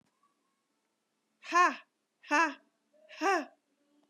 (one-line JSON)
{"exhalation_length": "4.1 s", "exhalation_amplitude": 8026, "exhalation_signal_mean_std_ratio": 0.31, "survey_phase": "beta (2021-08-13 to 2022-03-07)", "age": "45-64", "gender": "Female", "wearing_mask": "No", "symptom_none": true, "smoker_status": "Never smoked", "respiratory_condition_asthma": false, "respiratory_condition_other": false, "recruitment_source": "REACT", "submission_delay": "1 day", "covid_test_result": "Negative", "covid_test_method": "RT-qPCR", "influenza_a_test_result": "Negative", "influenza_b_test_result": "Negative"}